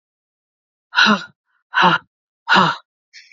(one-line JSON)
{"exhalation_length": "3.3 s", "exhalation_amplitude": 28216, "exhalation_signal_mean_std_ratio": 0.39, "survey_phase": "beta (2021-08-13 to 2022-03-07)", "age": "45-64", "gender": "Female", "wearing_mask": "No", "symptom_cough_any": true, "symptom_new_continuous_cough": true, "symptom_runny_or_blocked_nose": true, "symptom_shortness_of_breath": true, "symptom_sore_throat": true, "symptom_fatigue": true, "symptom_fever_high_temperature": true, "symptom_headache": true, "symptom_onset": "2 days", "smoker_status": "Never smoked", "respiratory_condition_asthma": false, "respiratory_condition_other": false, "recruitment_source": "Test and Trace", "submission_delay": "1 day", "covid_test_result": "Positive", "covid_test_method": "ePCR"}